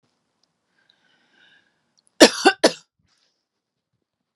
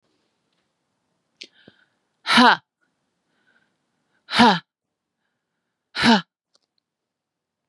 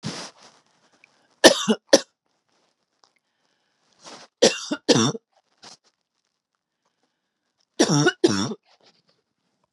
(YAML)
cough_length: 4.4 s
cough_amplitude: 32768
cough_signal_mean_std_ratio: 0.18
exhalation_length: 7.7 s
exhalation_amplitude: 31518
exhalation_signal_mean_std_ratio: 0.24
three_cough_length: 9.7 s
three_cough_amplitude: 32768
three_cough_signal_mean_std_ratio: 0.27
survey_phase: beta (2021-08-13 to 2022-03-07)
age: 18-44
gender: Female
wearing_mask: 'No'
symptom_none: true
smoker_status: Ex-smoker
respiratory_condition_asthma: false
respiratory_condition_other: false
recruitment_source: REACT
submission_delay: 2 days
covid_test_result: Negative
covid_test_method: RT-qPCR
influenza_a_test_result: Unknown/Void
influenza_b_test_result: Unknown/Void